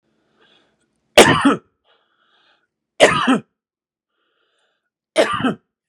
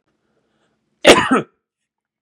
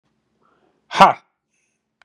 {
  "three_cough_length": "5.9 s",
  "three_cough_amplitude": 32768,
  "three_cough_signal_mean_std_ratio": 0.31,
  "cough_length": "2.2 s",
  "cough_amplitude": 32768,
  "cough_signal_mean_std_ratio": 0.28,
  "exhalation_length": "2.0 s",
  "exhalation_amplitude": 32768,
  "exhalation_signal_mean_std_ratio": 0.21,
  "survey_phase": "beta (2021-08-13 to 2022-03-07)",
  "age": "45-64",
  "gender": "Male",
  "wearing_mask": "No",
  "symptom_none": true,
  "smoker_status": "Ex-smoker",
  "respiratory_condition_asthma": false,
  "respiratory_condition_other": false,
  "recruitment_source": "REACT",
  "submission_delay": "1 day",
  "covid_test_result": "Negative",
  "covid_test_method": "RT-qPCR",
  "influenza_a_test_result": "Unknown/Void",
  "influenza_b_test_result": "Unknown/Void"
}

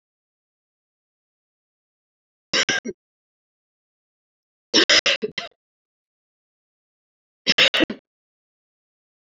{
  "three_cough_length": "9.3 s",
  "three_cough_amplitude": 24715,
  "three_cough_signal_mean_std_ratio": 0.24,
  "survey_phase": "beta (2021-08-13 to 2022-03-07)",
  "age": "45-64",
  "gender": "Female",
  "wearing_mask": "No",
  "symptom_cough_any": true,
  "symptom_new_continuous_cough": true,
  "symptom_runny_or_blocked_nose": true,
  "symptom_shortness_of_breath": true,
  "symptom_sore_throat": true,
  "symptom_fatigue": true,
  "symptom_headache": true,
  "symptom_change_to_sense_of_smell_or_taste": true,
  "symptom_loss_of_taste": true,
  "symptom_onset": "5 days",
  "smoker_status": "Never smoked",
  "respiratory_condition_asthma": false,
  "respiratory_condition_other": false,
  "recruitment_source": "Test and Trace",
  "submission_delay": "1 day",
  "covid_test_result": "Positive",
  "covid_test_method": "RT-qPCR",
  "covid_ct_value": 22.3,
  "covid_ct_gene": "ORF1ab gene",
  "covid_ct_mean": 23.3,
  "covid_viral_load": "23000 copies/ml",
  "covid_viral_load_category": "Low viral load (10K-1M copies/ml)"
}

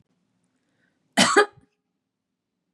{
  "cough_length": "2.7 s",
  "cough_amplitude": 23878,
  "cough_signal_mean_std_ratio": 0.24,
  "survey_phase": "beta (2021-08-13 to 2022-03-07)",
  "age": "45-64",
  "gender": "Female",
  "wearing_mask": "No",
  "symptom_none": true,
  "smoker_status": "Ex-smoker",
  "respiratory_condition_asthma": false,
  "respiratory_condition_other": false,
  "recruitment_source": "Test and Trace",
  "submission_delay": "4 days",
  "covid_test_result": "Negative",
  "covid_test_method": "RT-qPCR"
}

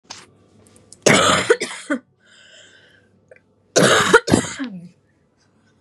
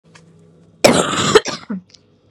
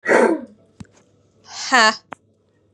{
  "three_cough_length": "5.8 s",
  "three_cough_amplitude": 32768,
  "three_cough_signal_mean_std_ratio": 0.38,
  "cough_length": "2.3 s",
  "cough_amplitude": 32768,
  "cough_signal_mean_std_ratio": 0.4,
  "exhalation_length": "2.7 s",
  "exhalation_amplitude": 32068,
  "exhalation_signal_mean_std_ratio": 0.39,
  "survey_phase": "beta (2021-08-13 to 2022-03-07)",
  "age": "18-44",
  "gender": "Female",
  "wearing_mask": "No",
  "symptom_cough_any": true,
  "symptom_new_continuous_cough": true,
  "symptom_sore_throat": true,
  "symptom_abdominal_pain": true,
  "symptom_fatigue": true,
  "symptom_headache": true,
  "symptom_other": true,
  "symptom_onset": "3 days",
  "smoker_status": "Never smoked",
  "respiratory_condition_asthma": false,
  "respiratory_condition_other": false,
  "recruitment_source": "Test and Trace",
  "submission_delay": "2 days",
  "covid_test_result": "Positive",
  "covid_test_method": "RT-qPCR",
  "covid_ct_value": 29.7,
  "covid_ct_gene": "ORF1ab gene",
  "covid_ct_mean": 30.4,
  "covid_viral_load": "110 copies/ml",
  "covid_viral_load_category": "Minimal viral load (< 10K copies/ml)"
}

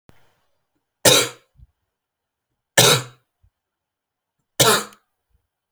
{
  "three_cough_length": "5.7 s",
  "three_cough_amplitude": 32768,
  "three_cough_signal_mean_std_ratio": 0.27,
  "survey_phase": "alpha (2021-03-01 to 2021-08-12)",
  "age": "18-44",
  "gender": "Male",
  "wearing_mask": "No",
  "symptom_fatigue": true,
  "smoker_status": "Current smoker (e-cigarettes or vapes only)",
  "respiratory_condition_asthma": false,
  "respiratory_condition_other": false,
  "recruitment_source": "Test and Trace",
  "submission_delay": "1 day",
  "covid_test_result": "Positive",
  "covid_test_method": "RT-qPCR",
  "covid_ct_value": 23.3,
  "covid_ct_gene": "ORF1ab gene",
  "covid_ct_mean": 23.9,
  "covid_viral_load": "15000 copies/ml",
  "covid_viral_load_category": "Low viral load (10K-1M copies/ml)"
}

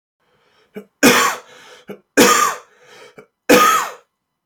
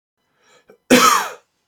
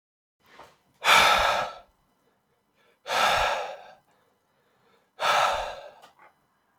{
  "three_cough_length": "4.5 s",
  "three_cough_amplitude": 32767,
  "three_cough_signal_mean_std_ratio": 0.42,
  "cough_length": "1.7 s",
  "cough_amplitude": 29994,
  "cough_signal_mean_std_ratio": 0.38,
  "exhalation_length": "6.8 s",
  "exhalation_amplitude": 18489,
  "exhalation_signal_mean_std_ratio": 0.41,
  "survey_phase": "beta (2021-08-13 to 2022-03-07)",
  "age": "18-44",
  "gender": "Male",
  "wearing_mask": "No",
  "symptom_none": true,
  "smoker_status": "Never smoked",
  "respiratory_condition_asthma": false,
  "respiratory_condition_other": false,
  "recruitment_source": "REACT",
  "submission_delay": "2 days",
  "covid_test_result": "Negative",
  "covid_test_method": "RT-qPCR",
  "influenza_a_test_result": "Negative",
  "influenza_b_test_result": "Negative"
}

